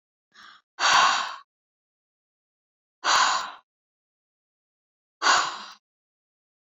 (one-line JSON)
{"exhalation_length": "6.7 s", "exhalation_amplitude": 16746, "exhalation_signal_mean_std_ratio": 0.34, "survey_phase": "beta (2021-08-13 to 2022-03-07)", "age": "45-64", "gender": "Female", "wearing_mask": "No", "symptom_none": true, "smoker_status": "Never smoked", "respiratory_condition_asthma": false, "respiratory_condition_other": false, "recruitment_source": "REACT", "submission_delay": "1 day", "covid_test_result": "Negative", "covid_test_method": "RT-qPCR", "influenza_a_test_result": "Negative", "influenza_b_test_result": "Negative"}